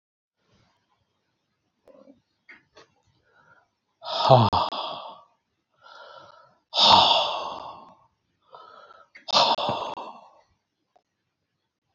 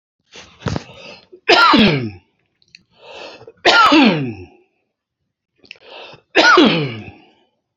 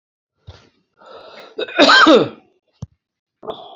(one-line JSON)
{"exhalation_length": "11.9 s", "exhalation_amplitude": 26987, "exhalation_signal_mean_std_ratio": 0.31, "three_cough_length": "7.8 s", "three_cough_amplitude": 31174, "three_cough_signal_mean_std_ratio": 0.43, "cough_length": "3.8 s", "cough_amplitude": 28997, "cough_signal_mean_std_ratio": 0.35, "survey_phase": "beta (2021-08-13 to 2022-03-07)", "age": "65+", "gender": "Male", "wearing_mask": "No", "symptom_none": true, "smoker_status": "Ex-smoker", "respiratory_condition_asthma": true, "respiratory_condition_other": false, "recruitment_source": "REACT", "submission_delay": "-1 day", "covid_test_result": "Negative", "covid_test_method": "RT-qPCR", "influenza_a_test_result": "Negative", "influenza_b_test_result": "Negative"}